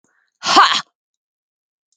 {"exhalation_length": "2.0 s", "exhalation_amplitude": 32768, "exhalation_signal_mean_std_ratio": 0.31, "survey_phase": "beta (2021-08-13 to 2022-03-07)", "age": "45-64", "gender": "Female", "wearing_mask": "No", "symptom_change_to_sense_of_smell_or_taste": true, "symptom_loss_of_taste": true, "symptom_onset": "12 days", "smoker_status": "Never smoked", "respiratory_condition_asthma": false, "respiratory_condition_other": false, "recruitment_source": "REACT", "submission_delay": "1 day", "covid_test_result": "Negative", "covid_test_method": "RT-qPCR", "influenza_a_test_result": "Negative", "influenza_b_test_result": "Negative"}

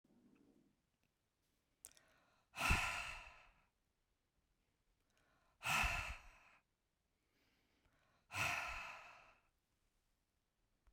{"exhalation_length": "10.9 s", "exhalation_amplitude": 2107, "exhalation_signal_mean_std_ratio": 0.32, "survey_phase": "beta (2021-08-13 to 2022-03-07)", "age": "65+", "gender": "Female", "wearing_mask": "No", "symptom_none": true, "smoker_status": "Never smoked", "respiratory_condition_asthma": false, "respiratory_condition_other": false, "recruitment_source": "Test and Trace", "submission_delay": "2 days", "covid_test_result": "Negative", "covid_test_method": "LFT"}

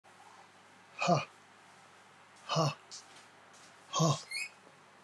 {"exhalation_length": "5.0 s", "exhalation_amplitude": 5049, "exhalation_signal_mean_std_ratio": 0.39, "survey_phase": "beta (2021-08-13 to 2022-03-07)", "age": "45-64", "gender": "Male", "wearing_mask": "No", "symptom_none": true, "smoker_status": "Never smoked", "respiratory_condition_asthma": false, "respiratory_condition_other": false, "recruitment_source": "REACT", "submission_delay": "1 day", "covid_test_result": "Negative", "covid_test_method": "RT-qPCR", "influenza_a_test_result": "Negative", "influenza_b_test_result": "Negative"}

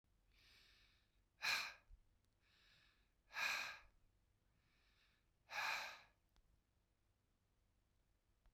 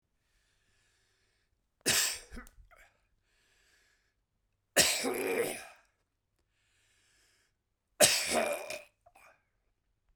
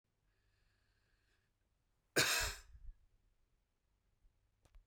{"exhalation_length": "8.5 s", "exhalation_amplitude": 1182, "exhalation_signal_mean_std_ratio": 0.32, "three_cough_length": "10.2 s", "three_cough_amplitude": 13310, "three_cough_signal_mean_std_ratio": 0.32, "cough_length": "4.9 s", "cough_amplitude": 4046, "cough_signal_mean_std_ratio": 0.25, "survey_phase": "beta (2021-08-13 to 2022-03-07)", "age": "45-64", "gender": "Male", "wearing_mask": "No", "symptom_headache": true, "symptom_other": true, "smoker_status": "Never smoked", "respiratory_condition_asthma": true, "respiratory_condition_other": false, "recruitment_source": "Test and Trace", "submission_delay": "3 days", "covid_test_result": "Negative", "covid_test_method": "RT-qPCR"}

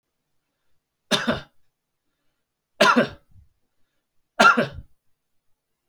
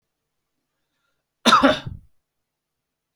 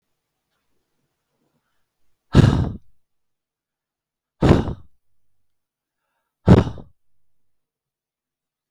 {"three_cough_length": "5.9 s", "three_cough_amplitude": 31583, "three_cough_signal_mean_std_ratio": 0.27, "cough_length": "3.2 s", "cough_amplitude": 29592, "cough_signal_mean_std_ratio": 0.26, "exhalation_length": "8.7 s", "exhalation_amplitude": 32768, "exhalation_signal_mean_std_ratio": 0.22, "survey_phase": "beta (2021-08-13 to 2022-03-07)", "age": "65+", "gender": "Male", "wearing_mask": "No", "symptom_runny_or_blocked_nose": true, "smoker_status": "Ex-smoker", "respiratory_condition_asthma": false, "respiratory_condition_other": false, "recruitment_source": "REACT", "submission_delay": "1 day", "covid_test_result": "Negative", "covid_test_method": "RT-qPCR", "influenza_a_test_result": "Negative", "influenza_b_test_result": "Negative"}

